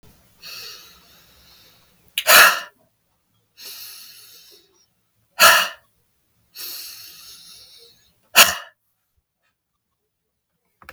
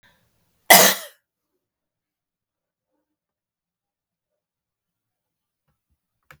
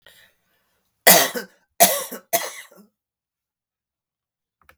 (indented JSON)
{
  "exhalation_length": "10.9 s",
  "exhalation_amplitude": 32768,
  "exhalation_signal_mean_std_ratio": 0.24,
  "cough_length": "6.4 s",
  "cough_amplitude": 32767,
  "cough_signal_mean_std_ratio": 0.15,
  "three_cough_length": "4.8 s",
  "three_cough_amplitude": 32768,
  "three_cough_signal_mean_std_ratio": 0.26,
  "survey_phase": "beta (2021-08-13 to 2022-03-07)",
  "age": "65+",
  "gender": "Female",
  "wearing_mask": "No",
  "symptom_fatigue": true,
  "symptom_headache": true,
  "symptom_onset": "3 days",
  "smoker_status": "Never smoked",
  "respiratory_condition_asthma": false,
  "respiratory_condition_other": false,
  "recruitment_source": "Test and Trace",
  "submission_delay": "1 day",
  "covid_test_result": "Positive",
  "covid_test_method": "RT-qPCR",
  "covid_ct_value": 33.0,
  "covid_ct_gene": "ORF1ab gene"
}